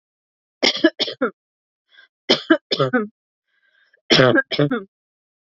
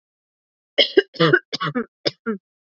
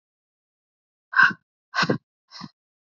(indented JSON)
{
  "three_cough_length": "5.5 s",
  "three_cough_amplitude": 29023,
  "three_cough_signal_mean_std_ratio": 0.38,
  "cough_length": "2.6 s",
  "cough_amplitude": 26805,
  "cough_signal_mean_std_ratio": 0.36,
  "exhalation_length": "2.9 s",
  "exhalation_amplitude": 21735,
  "exhalation_signal_mean_std_ratio": 0.27,
  "survey_phase": "beta (2021-08-13 to 2022-03-07)",
  "age": "18-44",
  "gender": "Female",
  "wearing_mask": "No",
  "symptom_none": true,
  "smoker_status": "Current smoker (e-cigarettes or vapes only)",
  "respiratory_condition_asthma": false,
  "respiratory_condition_other": false,
  "recruitment_source": "REACT",
  "submission_delay": "1 day",
  "covid_test_result": "Negative",
  "covid_test_method": "RT-qPCR",
  "influenza_a_test_result": "Negative",
  "influenza_b_test_result": "Negative"
}